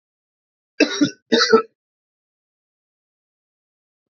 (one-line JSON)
{"cough_length": "4.1 s", "cough_amplitude": 28814, "cough_signal_mean_std_ratio": 0.26, "survey_phase": "alpha (2021-03-01 to 2021-08-12)", "age": "18-44", "gender": "Male", "wearing_mask": "No", "symptom_cough_any": true, "symptom_headache": true, "smoker_status": "Never smoked", "respiratory_condition_asthma": false, "respiratory_condition_other": false, "recruitment_source": "Test and Trace", "submission_delay": "1 day", "covid_test_result": "Positive", "covid_test_method": "RT-qPCR", "covid_ct_value": 13.3, "covid_ct_gene": "ORF1ab gene", "covid_ct_mean": 14.1, "covid_viral_load": "25000000 copies/ml", "covid_viral_load_category": "High viral load (>1M copies/ml)"}